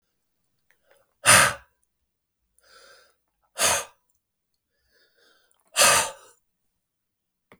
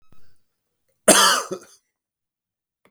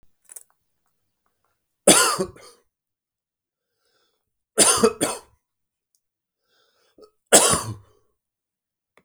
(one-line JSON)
{"exhalation_length": "7.6 s", "exhalation_amplitude": 32573, "exhalation_signal_mean_std_ratio": 0.25, "cough_length": "2.9 s", "cough_amplitude": 32768, "cough_signal_mean_std_ratio": 0.29, "three_cough_length": "9.0 s", "three_cough_amplitude": 32768, "three_cough_signal_mean_std_ratio": 0.26, "survey_phase": "beta (2021-08-13 to 2022-03-07)", "age": "45-64", "gender": "Male", "wearing_mask": "No", "symptom_none": true, "smoker_status": "Ex-smoker", "respiratory_condition_asthma": false, "respiratory_condition_other": false, "recruitment_source": "REACT", "submission_delay": "1 day", "covid_test_result": "Negative", "covid_test_method": "RT-qPCR"}